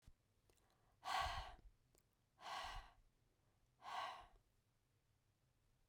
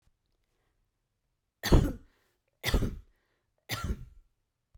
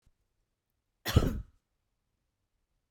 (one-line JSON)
{"exhalation_length": "5.9 s", "exhalation_amplitude": 1030, "exhalation_signal_mean_std_ratio": 0.4, "three_cough_length": "4.8 s", "three_cough_amplitude": 13567, "three_cough_signal_mean_std_ratio": 0.27, "cough_length": "2.9 s", "cough_amplitude": 12340, "cough_signal_mean_std_ratio": 0.22, "survey_phase": "beta (2021-08-13 to 2022-03-07)", "age": "45-64", "gender": "Female", "wearing_mask": "No", "symptom_none": true, "smoker_status": "Never smoked", "respiratory_condition_asthma": false, "respiratory_condition_other": false, "recruitment_source": "REACT", "submission_delay": "1 day", "covid_test_result": "Negative", "covid_test_method": "RT-qPCR"}